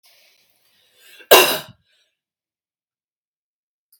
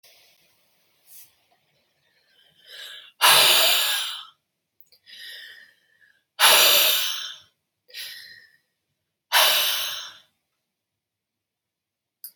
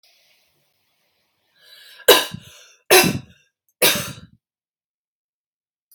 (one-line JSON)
{"cough_length": "4.0 s", "cough_amplitude": 32768, "cough_signal_mean_std_ratio": 0.19, "exhalation_length": "12.4 s", "exhalation_amplitude": 26422, "exhalation_signal_mean_std_ratio": 0.36, "three_cough_length": "5.9 s", "three_cough_amplitude": 32768, "three_cough_signal_mean_std_ratio": 0.25, "survey_phase": "beta (2021-08-13 to 2022-03-07)", "age": "18-44", "gender": "Female", "wearing_mask": "No", "symptom_runny_or_blocked_nose": true, "symptom_fatigue": true, "symptom_onset": "2 days", "smoker_status": "Ex-smoker", "respiratory_condition_asthma": false, "respiratory_condition_other": false, "recruitment_source": "REACT", "submission_delay": "1 day", "covid_test_result": "Negative", "covid_test_method": "RT-qPCR"}